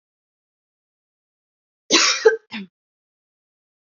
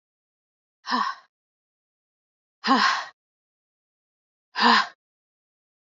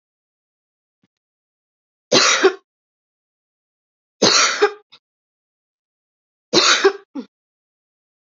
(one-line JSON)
{"cough_length": "3.8 s", "cough_amplitude": 28251, "cough_signal_mean_std_ratio": 0.25, "exhalation_length": "6.0 s", "exhalation_amplitude": 23075, "exhalation_signal_mean_std_ratio": 0.3, "three_cough_length": "8.4 s", "three_cough_amplitude": 30691, "three_cough_signal_mean_std_ratio": 0.3, "survey_phase": "alpha (2021-03-01 to 2021-08-12)", "age": "18-44", "gender": "Female", "wearing_mask": "No", "symptom_cough_any": true, "symptom_shortness_of_breath": true, "symptom_fatigue": true, "symptom_fever_high_temperature": true, "symptom_headache": true, "smoker_status": "Current smoker (e-cigarettes or vapes only)", "respiratory_condition_asthma": true, "respiratory_condition_other": false, "recruitment_source": "Test and Trace", "submission_delay": "1 day", "covid_test_result": "Positive", "covid_test_method": "LFT"}